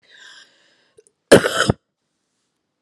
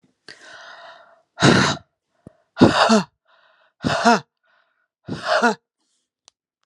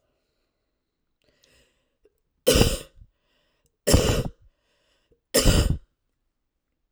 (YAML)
cough_length: 2.8 s
cough_amplitude: 32768
cough_signal_mean_std_ratio: 0.23
exhalation_length: 6.7 s
exhalation_amplitude: 32767
exhalation_signal_mean_std_ratio: 0.36
three_cough_length: 6.9 s
three_cough_amplitude: 29992
three_cough_signal_mean_std_ratio: 0.31
survey_phase: alpha (2021-03-01 to 2021-08-12)
age: 18-44
gender: Female
wearing_mask: 'No'
symptom_cough_any: true
smoker_status: Current smoker (1 to 10 cigarettes per day)
respiratory_condition_asthma: true
respiratory_condition_other: false
recruitment_source: Test and Trace
submission_delay: 2 days
covid_test_result: Positive
covid_test_method: RT-qPCR
covid_ct_value: 13.6
covid_ct_gene: N gene
covid_ct_mean: 13.9
covid_viral_load: 27000000 copies/ml
covid_viral_load_category: High viral load (>1M copies/ml)